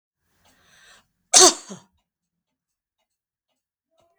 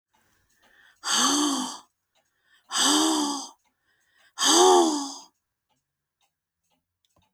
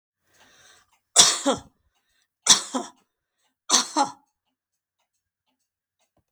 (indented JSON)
{
  "cough_length": "4.2 s",
  "cough_amplitude": 32768,
  "cough_signal_mean_std_ratio": 0.17,
  "exhalation_length": "7.3 s",
  "exhalation_amplitude": 17952,
  "exhalation_signal_mean_std_ratio": 0.43,
  "three_cough_length": "6.3 s",
  "three_cough_amplitude": 32768,
  "three_cough_signal_mean_std_ratio": 0.26,
  "survey_phase": "beta (2021-08-13 to 2022-03-07)",
  "age": "65+",
  "gender": "Female",
  "wearing_mask": "No",
  "symptom_none": true,
  "smoker_status": "Never smoked",
  "respiratory_condition_asthma": false,
  "respiratory_condition_other": false,
  "recruitment_source": "REACT",
  "submission_delay": "2 days",
  "covid_test_result": "Negative",
  "covid_test_method": "RT-qPCR",
  "influenza_a_test_result": "Negative",
  "influenza_b_test_result": "Negative"
}